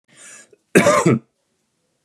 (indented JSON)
{
  "cough_length": "2.0 s",
  "cough_amplitude": 31550,
  "cough_signal_mean_std_ratio": 0.37,
  "survey_phase": "beta (2021-08-13 to 2022-03-07)",
  "age": "18-44",
  "gender": "Male",
  "wearing_mask": "No",
  "symptom_none": true,
  "smoker_status": "Never smoked",
  "respiratory_condition_asthma": false,
  "respiratory_condition_other": false,
  "recruitment_source": "REACT",
  "submission_delay": "4 days",
  "covid_test_method": "RT-qPCR",
  "influenza_a_test_result": "Unknown/Void",
  "influenza_b_test_result": "Unknown/Void"
}